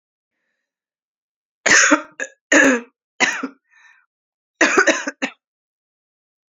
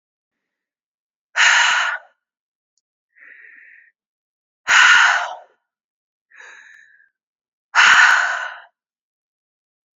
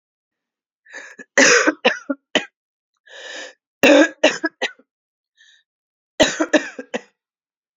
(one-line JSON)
{"cough_length": "6.5 s", "cough_amplitude": 32767, "cough_signal_mean_std_ratio": 0.35, "exhalation_length": "10.0 s", "exhalation_amplitude": 30117, "exhalation_signal_mean_std_ratio": 0.35, "three_cough_length": "7.8 s", "three_cough_amplitude": 32767, "three_cough_signal_mean_std_ratio": 0.33, "survey_phase": "beta (2021-08-13 to 2022-03-07)", "age": "45-64", "gender": "Female", "wearing_mask": "No", "symptom_cough_any": true, "symptom_sore_throat": true, "symptom_fatigue": true, "symptom_onset": "2 days", "smoker_status": "Prefer not to say", "respiratory_condition_asthma": false, "respiratory_condition_other": false, "recruitment_source": "Test and Trace", "submission_delay": "1 day", "covid_test_method": "RT-qPCR"}